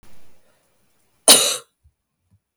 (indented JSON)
{
  "cough_length": "2.6 s",
  "cough_amplitude": 32768,
  "cough_signal_mean_std_ratio": 0.26,
  "survey_phase": "beta (2021-08-13 to 2022-03-07)",
  "age": "18-44",
  "gender": "Female",
  "wearing_mask": "No",
  "symptom_cough_any": true,
  "symptom_runny_or_blocked_nose": true,
  "symptom_fatigue": true,
  "symptom_headache": true,
  "symptom_onset": "3 days",
  "smoker_status": "Never smoked",
  "respiratory_condition_asthma": false,
  "respiratory_condition_other": false,
  "recruitment_source": "Test and Trace",
  "submission_delay": "2 days",
  "covid_test_result": "Positive",
  "covid_test_method": "RT-qPCR",
  "covid_ct_value": 24.4,
  "covid_ct_gene": "ORF1ab gene"
}